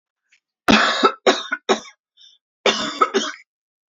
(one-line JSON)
{"cough_length": "3.9 s", "cough_amplitude": 28857, "cough_signal_mean_std_ratio": 0.42, "survey_phase": "alpha (2021-03-01 to 2021-08-12)", "age": "45-64", "gender": "Female", "wearing_mask": "No", "symptom_none": true, "smoker_status": "Current smoker (1 to 10 cigarettes per day)", "respiratory_condition_asthma": false, "respiratory_condition_other": false, "recruitment_source": "REACT", "submission_delay": "1 day", "covid_test_result": "Negative", "covid_test_method": "RT-qPCR"}